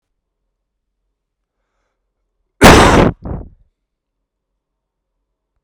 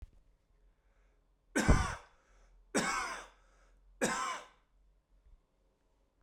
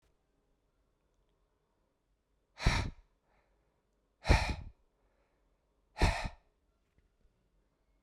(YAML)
cough_length: 5.6 s
cough_amplitude: 32768
cough_signal_mean_std_ratio: 0.26
three_cough_length: 6.2 s
three_cough_amplitude: 8569
three_cough_signal_mean_std_ratio: 0.33
exhalation_length: 8.0 s
exhalation_amplitude: 8626
exhalation_signal_mean_std_ratio: 0.24
survey_phase: beta (2021-08-13 to 2022-03-07)
age: 18-44
gender: Male
wearing_mask: 'No'
symptom_none: true
smoker_status: Never smoked
respiratory_condition_asthma: false
respiratory_condition_other: false
recruitment_source: REACT
submission_delay: 4 days
covid_test_result: Negative
covid_test_method: RT-qPCR